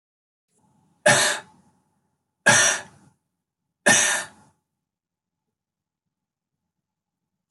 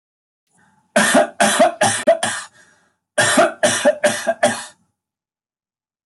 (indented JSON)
{
  "three_cough_length": "7.5 s",
  "three_cough_amplitude": 21914,
  "three_cough_signal_mean_std_ratio": 0.29,
  "cough_length": "6.1 s",
  "cough_amplitude": 25335,
  "cough_signal_mean_std_ratio": 0.49,
  "survey_phase": "alpha (2021-03-01 to 2021-08-12)",
  "age": "65+",
  "gender": "Male",
  "wearing_mask": "No",
  "symptom_none": true,
  "smoker_status": "Never smoked",
  "respiratory_condition_asthma": false,
  "respiratory_condition_other": false,
  "recruitment_source": "REACT",
  "submission_delay": "1 day",
  "covid_test_result": "Negative",
  "covid_test_method": "RT-qPCR"
}